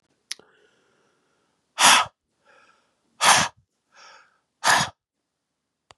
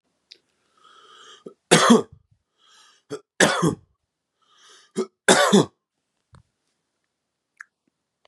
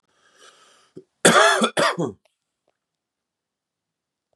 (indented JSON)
{
  "exhalation_length": "6.0 s",
  "exhalation_amplitude": 28462,
  "exhalation_signal_mean_std_ratio": 0.28,
  "three_cough_length": "8.3 s",
  "three_cough_amplitude": 32552,
  "three_cough_signal_mean_std_ratio": 0.28,
  "cough_length": "4.4 s",
  "cough_amplitude": 32409,
  "cough_signal_mean_std_ratio": 0.31,
  "survey_phase": "beta (2021-08-13 to 2022-03-07)",
  "age": "18-44",
  "gender": "Male",
  "wearing_mask": "No",
  "symptom_cough_any": true,
  "symptom_shortness_of_breath": true,
  "symptom_fatigue": true,
  "symptom_fever_high_temperature": true,
  "symptom_headache": true,
  "symptom_onset": "4 days",
  "smoker_status": "Ex-smoker",
  "respiratory_condition_asthma": false,
  "respiratory_condition_other": false,
  "recruitment_source": "Test and Trace",
  "submission_delay": "1 day",
  "covid_test_result": "Positive",
  "covid_test_method": "RT-qPCR",
  "covid_ct_value": 22.2,
  "covid_ct_gene": "ORF1ab gene",
  "covid_ct_mean": 22.5,
  "covid_viral_load": "43000 copies/ml",
  "covid_viral_load_category": "Low viral load (10K-1M copies/ml)"
}